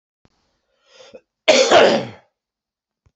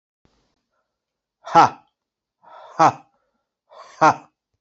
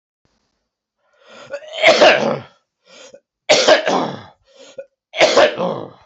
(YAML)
cough_length: 3.2 s
cough_amplitude: 28150
cough_signal_mean_std_ratio: 0.34
exhalation_length: 4.6 s
exhalation_amplitude: 28804
exhalation_signal_mean_std_ratio: 0.24
three_cough_length: 6.1 s
three_cough_amplitude: 31853
three_cough_signal_mean_std_ratio: 0.43
survey_phase: beta (2021-08-13 to 2022-03-07)
age: 45-64
gender: Male
wearing_mask: 'No'
symptom_cough_any: true
symptom_runny_or_blocked_nose: true
symptom_diarrhoea: true
symptom_fatigue: true
symptom_fever_high_temperature: true
symptom_headache: true
symptom_onset: 4 days
smoker_status: Never smoked
respiratory_condition_asthma: false
respiratory_condition_other: false
recruitment_source: Test and Trace
submission_delay: 1 day
covid_test_result: Positive
covid_test_method: RT-qPCR
covid_ct_value: 15.8
covid_ct_gene: ORF1ab gene
covid_ct_mean: 16.2
covid_viral_load: 4900000 copies/ml
covid_viral_load_category: High viral load (>1M copies/ml)